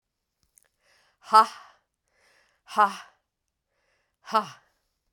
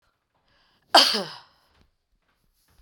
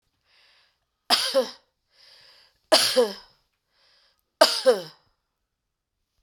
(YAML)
exhalation_length: 5.1 s
exhalation_amplitude: 21046
exhalation_signal_mean_std_ratio: 0.2
cough_length: 2.8 s
cough_amplitude: 27757
cough_signal_mean_std_ratio: 0.23
three_cough_length: 6.2 s
three_cough_amplitude: 27869
three_cough_signal_mean_std_ratio: 0.31
survey_phase: beta (2021-08-13 to 2022-03-07)
age: 45-64
gender: Female
wearing_mask: 'No'
symptom_none: true
smoker_status: Never smoked
respiratory_condition_asthma: false
respiratory_condition_other: false
recruitment_source: REACT
submission_delay: 3 days
covid_test_result: Negative
covid_test_method: RT-qPCR